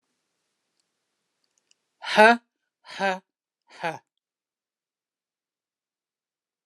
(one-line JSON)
{"exhalation_length": "6.7 s", "exhalation_amplitude": 29203, "exhalation_signal_mean_std_ratio": 0.18, "survey_phase": "alpha (2021-03-01 to 2021-08-12)", "age": "45-64", "gender": "Female", "wearing_mask": "No", "symptom_none": true, "smoker_status": "Never smoked", "respiratory_condition_asthma": false, "respiratory_condition_other": false, "recruitment_source": "REACT", "submission_delay": "2 days", "covid_test_result": "Negative", "covid_test_method": "RT-qPCR"}